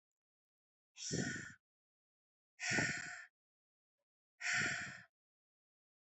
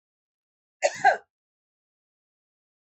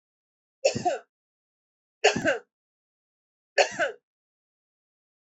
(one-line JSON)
{"exhalation_length": "6.1 s", "exhalation_amplitude": 2165, "exhalation_signal_mean_std_ratio": 0.39, "cough_length": "2.8 s", "cough_amplitude": 15028, "cough_signal_mean_std_ratio": 0.2, "three_cough_length": "5.2 s", "three_cough_amplitude": 15735, "three_cough_signal_mean_std_ratio": 0.29, "survey_phase": "alpha (2021-03-01 to 2021-08-12)", "age": "65+", "gender": "Female", "wearing_mask": "No", "symptom_none": true, "smoker_status": "Ex-smoker", "respiratory_condition_asthma": false, "respiratory_condition_other": false, "recruitment_source": "REACT", "submission_delay": "1 day", "covid_test_result": "Negative", "covid_test_method": "RT-qPCR"}